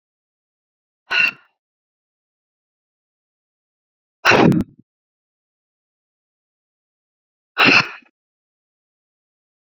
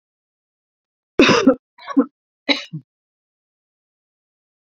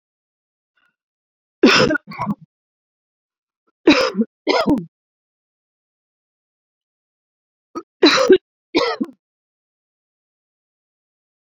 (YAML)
exhalation_length: 9.6 s
exhalation_amplitude: 30730
exhalation_signal_mean_std_ratio: 0.23
cough_length: 4.7 s
cough_amplitude: 31189
cough_signal_mean_std_ratio: 0.26
three_cough_length: 11.5 s
three_cough_amplitude: 29081
three_cough_signal_mean_std_ratio: 0.29
survey_phase: beta (2021-08-13 to 2022-03-07)
age: 45-64
gender: Female
wearing_mask: 'No'
symptom_none: true
smoker_status: Never smoked
respiratory_condition_asthma: false
respiratory_condition_other: false
recruitment_source: REACT
submission_delay: 3 days
covid_test_result: Negative
covid_test_method: RT-qPCR
influenza_a_test_result: Negative
influenza_b_test_result: Negative